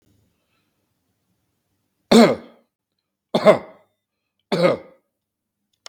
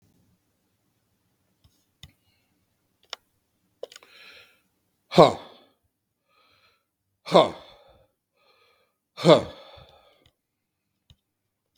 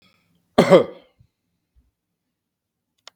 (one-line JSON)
{"three_cough_length": "5.9 s", "three_cough_amplitude": 32768, "three_cough_signal_mean_std_ratio": 0.25, "exhalation_length": "11.8 s", "exhalation_amplitude": 32768, "exhalation_signal_mean_std_ratio": 0.16, "cough_length": "3.2 s", "cough_amplitude": 32768, "cough_signal_mean_std_ratio": 0.21, "survey_phase": "beta (2021-08-13 to 2022-03-07)", "age": "65+", "gender": "Male", "wearing_mask": "No", "symptom_none": true, "smoker_status": "Ex-smoker", "respiratory_condition_asthma": false, "respiratory_condition_other": false, "recruitment_source": "REACT", "submission_delay": "1 day", "covid_test_result": "Negative", "covid_test_method": "RT-qPCR", "influenza_a_test_result": "Negative", "influenza_b_test_result": "Negative"}